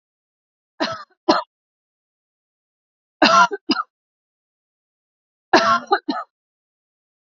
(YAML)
three_cough_length: 7.3 s
three_cough_amplitude: 32767
three_cough_signal_mean_std_ratio: 0.29
survey_phase: beta (2021-08-13 to 2022-03-07)
age: 45-64
gender: Female
wearing_mask: 'No'
symptom_none: true
smoker_status: Ex-smoker
respiratory_condition_asthma: false
respiratory_condition_other: false
recruitment_source: REACT
submission_delay: 1 day
covid_test_result: Negative
covid_test_method: RT-qPCR
influenza_a_test_result: Negative
influenza_b_test_result: Negative